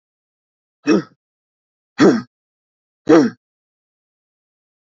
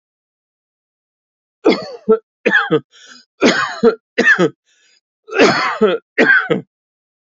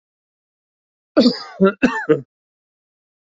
{
  "exhalation_length": "4.9 s",
  "exhalation_amplitude": 27621,
  "exhalation_signal_mean_std_ratio": 0.27,
  "three_cough_length": "7.3 s",
  "three_cough_amplitude": 31610,
  "three_cough_signal_mean_std_ratio": 0.46,
  "cough_length": "3.3 s",
  "cough_amplitude": 27741,
  "cough_signal_mean_std_ratio": 0.32,
  "survey_phase": "alpha (2021-03-01 to 2021-08-12)",
  "age": "65+",
  "gender": "Male",
  "wearing_mask": "No",
  "symptom_none": true,
  "smoker_status": "Never smoked",
  "respiratory_condition_asthma": false,
  "respiratory_condition_other": false,
  "recruitment_source": "REACT",
  "submission_delay": "1 day",
  "covid_test_result": "Negative",
  "covid_test_method": "RT-qPCR"
}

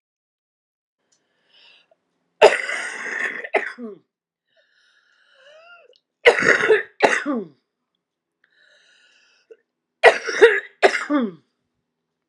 {
  "three_cough_length": "12.3 s",
  "three_cough_amplitude": 32768,
  "three_cough_signal_mean_std_ratio": 0.31,
  "survey_phase": "alpha (2021-03-01 to 2021-08-12)",
  "age": "45-64",
  "gender": "Female",
  "wearing_mask": "No",
  "symptom_fatigue": true,
  "symptom_headache": true,
  "symptom_change_to_sense_of_smell_or_taste": true,
  "symptom_onset": "5 days",
  "smoker_status": "Ex-smoker",
  "respiratory_condition_asthma": true,
  "respiratory_condition_other": false,
  "recruitment_source": "Test and Trace",
  "submission_delay": "2 days",
  "covid_test_result": "Positive",
  "covid_test_method": "RT-qPCR",
  "covid_ct_value": 12.3,
  "covid_ct_gene": "ORF1ab gene",
  "covid_ct_mean": 12.9,
  "covid_viral_load": "61000000 copies/ml",
  "covid_viral_load_category": "High viral load (>1M copies/ml)"
}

